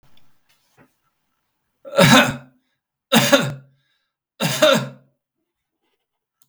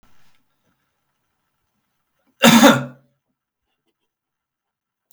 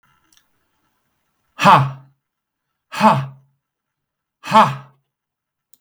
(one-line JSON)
{"three_cough_length": "6.5 s", "three_cough_amplitude": 32768, "three_cough_signal_mean_std_ratio": 0.33, "cough_length": "5.1 s", "cough_amplitude": 32768, "cough_signal_mean_std_ratio": 0.22, "exhalation_length": "5.8 s", "exhalation_amplitude": 32768, "exhalation_signal_mean_std_ratio": 0.29, "survey_phase": "beta (2021-08-13 to 2022-03-07)", "age": "65+", "gender": "Male", "wearing_mask": "No", "symptom_none": true, "smoker_status": "Never smoked", "respiratory_condition_asthma": false, "respiratory_condition_other": false, "recruitment_source": "Test and Trace", "submission_delay": "2 days", "covid_test_result": "Negative", "covid_test_method": "RT-qPCR"}